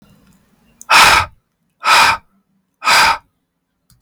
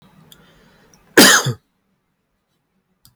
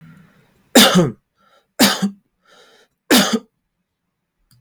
{"exhalation_length": "4.0 s", "exhalation_amplitude": 32768, "exhalation_signal_mean_std_ratio": 0.43, "cough_length": "3.2 s", "cough_amplitude": 32768, "cough_signal_mean_std_ratio": 0.26, "three_cough_length": "4.6 s", "three_cough_amplitude": 32768, "three_cough_signal_mean_std_ratio": 0.36, "survey_phase": "beta (2021-08-13 to 2022-03-07)", "age": "18-44", "gender": "Male", "wearing_mask": "No", "symptom_none": true, "smoker_status": "Never smoked", "respiratory_condition_asthma": false, "respiratory_condition_other": false, "recruitment_source": "REACT", "submission_delay": "3 days", "covid_test_result": "Negative", "covid_test_method": "RT-qPCR"}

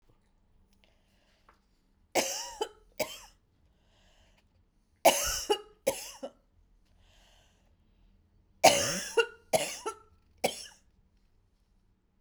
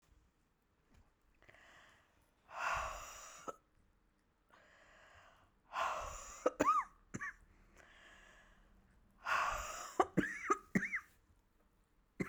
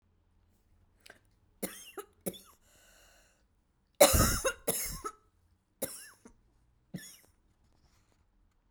{"three_cough_length": "12.2 s", "three_cough_amplitude": 17219, "three_cough_signal_mean_std_ratio": 0.28, "exhalation_length": "12.3 s", "exhalation_amplitude": 5424, "exhalation_signal_mean_std_ratio": 0.37, "cough_length": "8.7 s", "cough_amplitude": 16540, "cough_signal_mean_std_ratio": 0.25, "survey_phase": "beta (2021-08-13 to 2022-03-07)", "age": "18-44", "gender": "Female", "wearing_mask": "No", "symptom_cough_any": true, "symptom_runny_or_blocked_nose": true, "symptom_sore_throat": true, "symptom_diarrhoea": true, "symptom_fatigue": true, "symptom_fever_high_temperature": true, "symptom_headache": true, "symptom_loss_of_taste": true, "symptom_onset": "4 days", "smoker_status": "Never smoked", "respiratory_condition_asthma": false, "respiratory_condition_other": false, "recruitment_source": "Test and Trace", "submission_delay": "2 days", "covid_test_result": "Positive", "covid_test_method": "RT-qPCR", "covid_ct_value": 36.5, "covid_ct_gene": "N gene"}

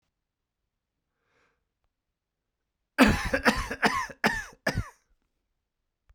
{"cough_length": "6.1 s", "cough_amplitude": 17112, "cough_signal_mean_std_ratio": 0.31, "survey_phase": "beta (2021-08-13 to 2022-03-07)", "age": "18-44", "gender": "Male", "wearing_mask": "No", "symptom_cough_any": true, "symptom_fatigue": true, "symptom_fever_high_temperature": true, "symptom_headache": true, "smoker_status": "Never smoked", "respiratory_condition_asthma": false, "respiratory_condition_other": false, "recruitment_source": "Test and Trace", "submission_delay": "2 days", "covid_test_result": "Positive", "covid_test_method": "RT-qPCR", "covid_ct_value": 26.0, "covid_ct_gene": "ORF1ab gene"}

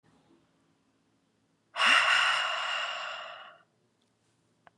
{"exhalation_length": "4.8 s", "exhalation_amplitude": 13371, "exhalation_signal_mean_std_ratio": 0.42, "survey_phase": "beta (2021-08-13 to 2022-03-07)", "age": "18-44", "gender": "Female", "wearing_mask": "No", "symptom_headache": true, "smoker_status": "Current smoker (e-cigarettes or vapes only)", "respiratory_condition_asthma": false, "respiratory_condition_other": false, "recruitment_source": "Test and Trace", "submission_delay": "0 days", "covid_test_result": "Negative", "covid_test_method": "LFT"}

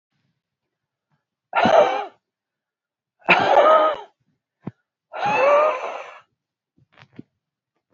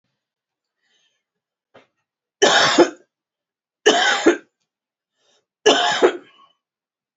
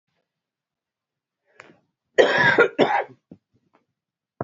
{"exhalation_length": "7.9 s", "exhalation_amplitude": 28229, "exhalation_signal_mean_std_ratio": 0.39, "three_cough_length": "7.2 s", "three_cough_amplitude": 29592, "three_cough_signal_mean_std_ratio": 0.34, "cough_length": "4.4 s", "cough_amplitude": 28369, "cough_signal_mean_std_ratio": 0.32, "survey_phase": "beta (2021-08-13 to 2022-03-07)", "age": "45-64", "gender": "Female", "wearing_mask": "No", "symptom_cough_any": true, "symptom_new_continuous_cough": true, "symptom_change_to_sense_of_smell_or_taste": true, "symptom_onset": "5 days", "smoker_status": "Never smoked", "respiratory_condition_asthma": false, "respiratory_condition_other": false, "recruitment_source": "Test and Trace", "submission_delay": "1 day", "covid_test_result": "Positive", "covid_test_method": "RT-qPCR", "covid_ct_value": 21.8, "covid_ct_gene": "ORF1ab gene", "covid_ct_mean": 22.4, "covid_viral_load": "44000 copies/ml", "covid_viral_load_category": "Low viral load (10K-1M copies/ml)"}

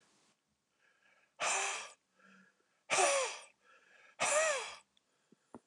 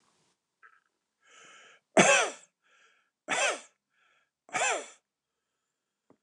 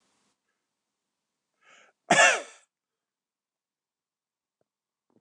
{"exhalation_length": "5.7 s", "exhalation_amplitude": 5251, "exhalation_signal_mean_std_ratio": 0.41, "three_cough_length": "6.2 s", "three_cough_amplitude": 18172, "three_cough_signal_mean_std_ratio": 0.28, "cough_length": "5.2 s", "cough_amplitude": 14909, "cough_signal_mean_std_ratio": 0.18, "survey_phase": "beta (2021-08-13 to 2022-03-07)", "age": "65+", "gender": "Male", "wearing_mask": "No", "symptom_none": true, "smoker_status": "Ex-smoker", "respiratory_condition_asthma": false, "respiratory_condition_other": false, "recruitment_source": "REACT", "submission_delay": "2 days", "covid_test_result": "Negative", "covid_test_method": "RT-qPCR", "influenza_a_test_result": "Negative", "influenza_b_test_result": "Negative"}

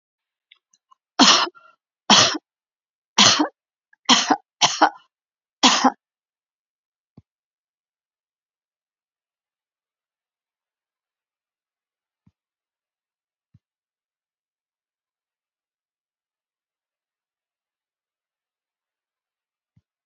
{"cough_length": "20.1 s", "cough_amplitude": 32767, "cough_signal_mean_std_ratio": 0.2, "survey_phase": "beta (2021-08-13 to 2022-03-07)", "age": "65+", "gender": "Female", "wearing_mask": "No", "symptom_none": true, "smoker_status": "Ex-smoker", "respiratory_condition_asthma": false, "respiratory_condition_other": false, "recruitment_source": "REACT", "submission_delay": "1 day", "covid_test_result": "Negative", "covid_test_method": "RT-qPCR"}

